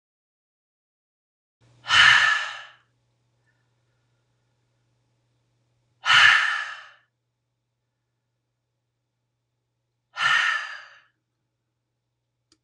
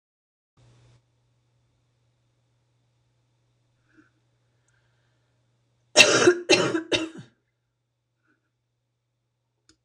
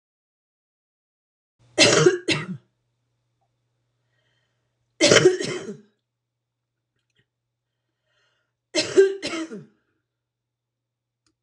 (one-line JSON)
{"exhalation_length": "12.6 s", "exhalation_amplitude": 24102, "exhalation_signal_mean_std_ratio": 0.28, "cough_length": "9.8 s", "cough_amplitude": 26028, "cough_signal_mean_std_ratio": 0.22, "three_cough_length": "11.4 s", "three_cough_amplitude": 25930, "three_cough_signal_mean_std_ratio": 0.27, "survey_phase": "alpha (2021-03-01 to 2021-08-12)", "age": "65+", "gender": "Female", "wearing_mask": "No", "symptom_cough_any": true, "smoker_status": "Ex-smoker", "respiratory_condition_asthma": false, "respiratory_condition_other": false, "recruitment_source": "REACT", "submission_delay": "1 day", "covid_test_result": "Negative", "covid_test_method": "RT-qPCR"}